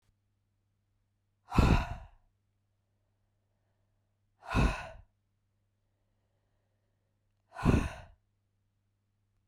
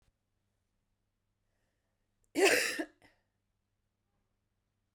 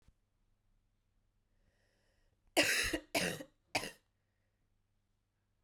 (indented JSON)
{
  "exhalation_length": "9.5 s",
  "exhalation_amplitude": 9866,
  "exhalation_signal_mean_std_ratio": 0.24,
  "cough_length": "4.9 s",
  "cough_amplitude": 6882,
  "cough_signal_mean_std_ratio": 0.23,
  "three_cough_length": "5.6 s",
  "three_cough_amplitude": 5945,
  "three_cough_signal_mean_std_ratio": 0.29,
  "survey_phase": "beta (2021-08-13 to 2022-03-07)",
  "age": "18-44",
  "gender": "Female",
  "wearing_mask": "No",
  "symptom_cough_any": true,
  "symptom_runny_or_blocked_nose": true,
  "symptom_sore_throat": true,
  "symptom_fatigue": true,
  "symptom_headache": true,
  "symptom_change_to_sense_of_smell_or_taste": true,
  "smoker_status": "Never smoked",
  "respiratory_condition_asthma": true,
  "respiratory_condition_other": false,
  "recruitment_source": "Test and Trace",
  "submission_delay": "2 days",
  "covid_test_result": "Positive",
  "covid_test_method": "ePCR"
}